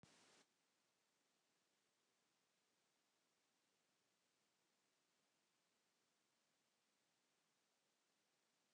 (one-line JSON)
{"exhalation_length": "8.7 s", "exhalation_amplitude": 69, "exhalation_signal_mean_std_ratio": 0.66, "survey_phase": "beta (2021-08-13 to 2022-03-07)", "age": "65+", "gender": "Male", "wearing_mask": "No", "symptom_none": true, "smoker_status": "Never smoked", "respiratory_condition_asthma": false, "respiratory_condition_other": false, "recruitment_source": "REACT", "submission_delay": "3 days", "covid_test_result": "Negative", "covid_test_method": "RT-qPCR"}